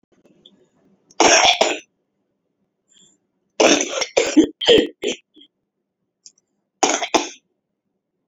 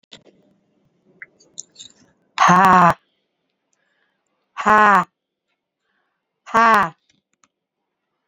{"three_cough_length": "8.3 s", "three_cough_amplitude": 32767, "three_cough_signal_mean_std_ratio": 0.36, "exhalation_length": "8.3 s", "exhalation_amplitude": 32767, "exhalation_signal_mean_std_ratio": 0.3, "survey_phase": "alpha (2021-03-01 to 2021-08-12)", "age": "65+", "gender": "Female", "wearing_mask": "No", "symptom_shortness_of_breath": true, "symptom_diarrhoea": true, "symptom_fatigue": true, "smoker_status": "Ex-smoker", "respiratory_condition_asthma": true, "respiratory_condition_other": true, "recruitment_source": "Test and Trace", "submission_delay": "4 days", "covid_test_result": "Negative", "covid_test_method": "LFT"}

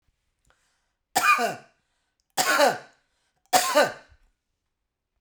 {"three_cough_length": "5.2 s", "three_cough_amplitude": 20085, "three_cough_signal_mean_std_ratio": 0.36, "survey_phase": "beta (2021-08-13 to 2022-03-07)", "age": "45-64", "gender": "Female", "wearing_mask": "No", "symptom_none": true, "smoker_status": "Ex-smoker", "respiratory_condition_asthma": false, "respiratory_condition_other": false, "recruitment_source": "REACT", "submission_delay": "1 day", "covid_test_result": "Negative", "covid_test_method": "RT-qPCR"}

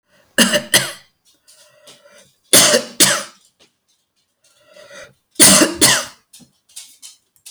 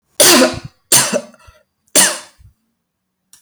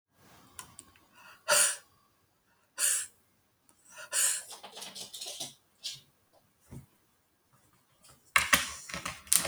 {"cough_length": "7.5 s", "cough_amplitude": 32768, "cough_signal_mean_std_ratio": 0.36, "three_cough_length": "3.4 s", "three_cough_amplitude": 32768, "three_cough_signal_mean_std_ratio": 0.42, "exhalation_length": "9.5 s", "exhalation_amplitude": 32768, "exhalation_signal_mean_std_ratio": 0.33, "survey_phase": "alpha (2021-03-01 to 2021-08-12)", "age": "45-64", "gender": "Female", "wearing_mask": "No", "symptom_none": true, "smoker_status": "Ex-smoker", "respiratory_condition_asthma": false, "respiratory_condition_other": false, "recruitment_source": "REACT", "submission_delay": "1 day", "covid_test_result": "Negative", "covid_test_method": "RT-qPCR"}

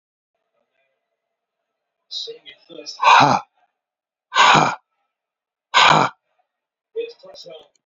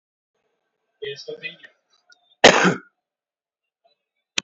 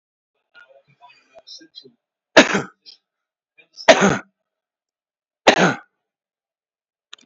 {"exhalation_length": "7.9 s", "exhalation_amplitude": 31142, "exhalation_signal_mean_std_ratio": 0.32, "cough_length": "4.4 s", "cough_amplitude": 32044, "cough_signal_mean_std_ratio": 0.22, "three_cough_length": "7.3 s", "three_cough_amplitude": 30456, "three_cough_signal_mean_std_ratio": 0.24, "survey_phase": "beta (2021-08-13 to 2022-03-07)", "age": "45-64", "gender": "Male", "wearing_mask": "No", "symptom_none": true, "smoker_status": "Current smoker (11 or more cigarettes per day)", "respiratory_condition_asthma": false, "respiratory_condition_other": false, "recruitment_source": "REACT", "submission_delay": "8 days", "covid_test_result": "Negative", "covid_test_method": "RT-qPCR"}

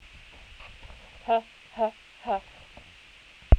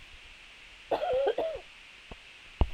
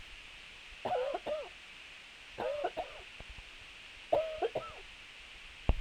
{"exhalation_length": "3.6 s", "exhalation_amplitude": 21656, "exhalation_signal_mean_std_ratio": 0.27, "cough_length": "2.7 s", "cough_amplitude": 12647, "cough_signal_mean_std_ratio": 0.5, "three_cough_length": "5.8 s", "three_cough_amplitude": 8204, "three_cough_signal_mean_std_ratio": 0.57, "survey_phase": "beta (2021-08-13 to 2022-03-07)", "age": "18-44", "gender": "Female", "wearing_mask": "No", "symptom_cough_any": true, "symptom_runny_or_blocked_nose": true, "symptom_shortness_of_breath": true, "symptom_fatigue": true, "symptom_headache": true, "smoker_status": "Never smoked", "respiratory_condition_asthma": false, "respiratory_condition_other": false, "recruitment_source": "Test and Trace", "submission_delay": "1 day", "covid_test_result": "Positive", "covid_test_method": "RT-qPCR"}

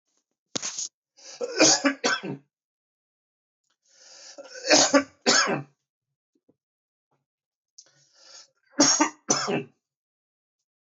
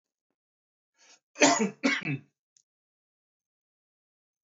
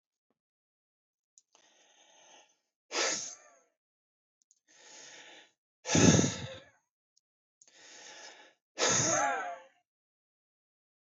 {"three_cough_length": "10.8 s", "three_cough_amplitude": 19515, "three_cough_signal_mean_std_ratio": 0.34, "cough_length": "4.4 s", "cough_amplitude": 17208, "cough_signal_mean_std_ratio": 0.26, "exhalation_length": "11.0 s", "exhalation_amplitude": 11008, "exhalation_signal_mean_std_ratio": 0.3, "survey_phase": "beta (2021-08-13 to 2022-03-07)", "age": "45-64", "gender": "Male", "wearing_mask": "No", "symptom_cough_any": true, "smoker_status": "Never smoked", "respiratory_condition_asthma": false, "respiratory_condition_other": false, "recruitment_source": "Test and Trace", "submission_delay": "1 day", "covid_test_result": "Positive", "covid_test_method": "RT-qPCR", "covid_ct_value": 23.1, "covid_ct_gene": "ORF1ab gene"}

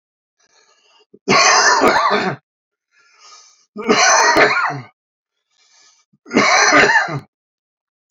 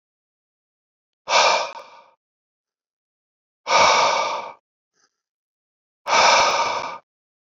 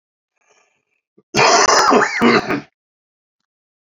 {"three_cough_length": "8.1 s", "three_cough_amplitude": 32768, "three_cough_signal_mean_std_ratio": 0.51, "exhalation_length": "7.6 s", "exhalation_amplitude": 25037, "exhalation_signal_mean_std_ratio": 0.41, "cough_length": "3.8 s", "cough_amplitude": 32320, "cough_signal_mean_std_ratio": 0.46, "survey_phase": "beta (2021-08-13 to 2022-03-07)", "age": "45-64", "gender": "Male", "wearing_mask": "No", "symptom_cough_any": true, "symptom_runny_or_blocked_nose": true, "symptom_onset": "6 days", "smoker_status": "Never smoked", "respiratory_condition_asthma": true, "respiratory_condition_other": false, "recruitment_source": "Test and Trace", "submission_delay": "1 day", "covid_test_result": "Positive", "covid_test_method": "RT-qPCR", "covid_ct_value": 30.9, "covid_ct_gene": "N gene"}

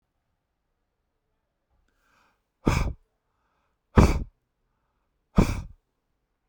{"exhalation_length": "6.5 s", "exhalation_amplitude": 25081, "exhalation_signal_mean_std_ratio": 0.23, "survey_phase": "beta (2021-08-13 to 2022-03-07)", "age": "45-64", "gender": "Male", "wearing_mask": "No", "symptom_none": true, "smoker_status": "Never smoked", "respiratory_condition_asthma": false, "respiratory_condition_other": false, "recruitment_source": "REACT", "submission_delay": "1 day", "covid_test_result": "Negative", "covid_test_method": "RT-qPCR"}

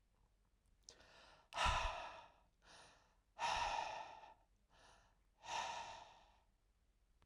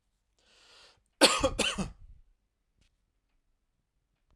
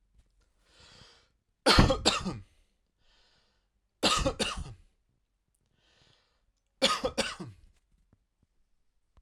{"exhalation_length": "7.3 s", "exhalation_amplitude": 1715, "exhalation_signal_mean_std_ratio": 0.43, "cough_length": "4.4 s", "cough_amplitude": 17870, "cough_signal_mean_std_ratio": 0.26, "three_cough_length": "9.2 s", "three_cough_amplitude": 17482, "three_cough_signal_mean_std_ratio": 0.3, "survey_phase": "alpha (2021-03-01 to 2021-08-12)", "age": "18-44", "gender": "Male", "wearing_mask": "No", "symptom_none": true, "symptom_onset": "6 days", "smoker_status": "Never smoked", "respiratory_condition_asthma": false, "respiratory_condition_other": false, "recruitment_source": "REACT", "submission_delay": "1 day", "covid_test_result": "Negative", "covid_test_method": "RT-qPCR"}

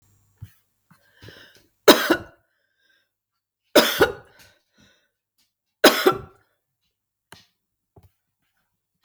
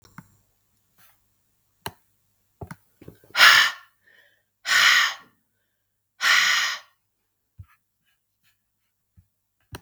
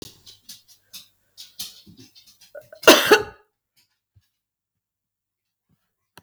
{"three_cough_length": "9.0 s", "three_cough_amplitude": 32768, "three_cough_signal_mean_std_ratio": 0.22, "exhalation_length": "9.8 s", "exhalation_amplitude": 32768, "exhalation_signal_mean_std_ratio": 0.29, "cough_length": "6.2 s", "cough_amplitude": 32768, "cough_signal_mean_std_ratio": 0.19, "survey_phase": "beta (2021-08-13 to 2022-03-07)", "age": "45-64", "gender": "Female", "wearing_mask": "No", "symptom_runny_or_blocked_nose": true, "symptom_sore_throat": true, "symptom_fatigue": true, "smoker_status": "Never smoked", "respiratory_condition_asthma": false, "respiratory_condition_other": false, "recruitment_source": "REACT", "submission_delay": "3 days", "covid_test_result": "Negative", "covid_test_method": "RT-qPCR", "influenza_a_test_result": "Negative", "influenza_b_test_result": "Negative"}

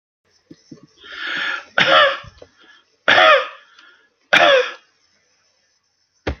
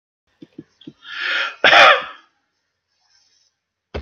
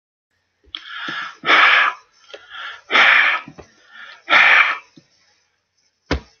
{"three_cough_length": "6.4 s", "three_cough_amplitude": 30927, "three_cough_signal_mean_std_ratio": 0.39, "cough_length": "4.0 s", "cough_amplitude": 30911, "cough_signal_mean_std_ratio": 0.31, "exhalation_length": "6.4 s", "exhalation_amplitude": 29374, "exhalation_signal_mean_std_ratio": 0.44, "survey_phase": "beta (2021-08-13 to 2022-03-07)", "age": "65+", "gender": "Male", "wearing_mask": "No", "symptom_none": true, "smoker_status": "Never smoked", "respiratory_condition_asthma": false, "respiratory_condition_other": false, "recruitment_source": "REACT", "submission_delay": "3 days", "covid_test_result": "Negative", "covid_test_method": "RT-qPCR", "influenza_a_test_result": "Negative", "influenza_b_test_result": "Negative"}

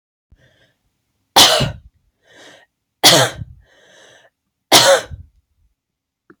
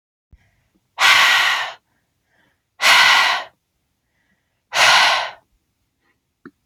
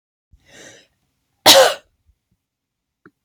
{"three_cough_length": "6.4 s", "three_cough_amplitude": 32768, "three_cough_signal_mean_std_ratio": 0.31, "exhalation_length": "6.7 s", "exhalation_amplitude": 30722, "exhalation_signal_mean_std_ratio": 0.43, "cough_length": "3.2 s", "cough_amplitude": 32768, "cough_signal_mean_std_ratio": 0.24, "survey_phase": "beta (2021-08-13 to 2022-03-07)", "age": "18-44", "gender": "Female", "wearing_mask": "No", "symptom_none": true, "smoker_status": "Ex-smoker", "respiratory_condition_asthma": false, "respiratory_condition_other": false, "recruitment_source": "Test and Trace", "submission_delay": "1 day", "covid_test_result": "Negative", "covid_test_method": "RT-qPCR"}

